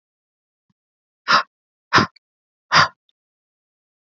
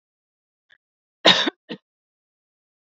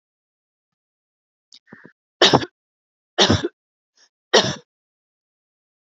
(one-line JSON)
{"exhalation_length": "4.1 s", "exhalation_amplitude": 30941, "exhalation_signal_mean_std_ratio": 0.24, "cough_length": "3.0 s", "cough_amplitude": 27457, "cough_signal_mean_std_ratio": 0.2, "three_cough_length": "5.8 s", "three_cough_amplitude": 32767, "three_cough_signal_mean_std_ratio": 0.24, "survey_phase": "beta (2021-08-13 to 2022-03-07)", "age": "45-64", "gender": "Female", "wearing_mask": "No", "symptom_cough_any": true, "symptom_runny_or_blocked_nose": true, "smoker_status": "Never smoked", "respiratory_condition_asthma": false, "respiratory_condition_other": false, "recruitment_source": "REACT", "submission_delay": "1 day", "covid_test_result": "Negative", "covid_test_method": "RT-qPCR", "influenza_a_test_result": "Negative", "influenza_b_test_result": "Negative"}